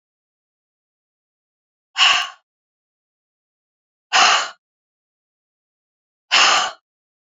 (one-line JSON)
{"exhalation_length": "7.3 s", "exhalation_amplitude": 29226, "exhalation_signal_mean_std_ratio": 0.29, "survey_phase": "beta (2021-08-13 to 2022-03-07)", "age": "45-64", "gender": "Female", "wearing_mask": "No", "symptom_cough_any": true, "symptom_runny_or_blocked_nose": true, "symptom_sore_throat": true, "symptom_onset": "3 days", "smoker_status": "Never smoked", "respiratory_condition_asthma": false, "respiratory_condition_other": false, "recruitment_source": "Test and Trace", "submission_delay": "1 day", "covid_test_result": "Positive", "covid_test_method": "RT-qPCR"}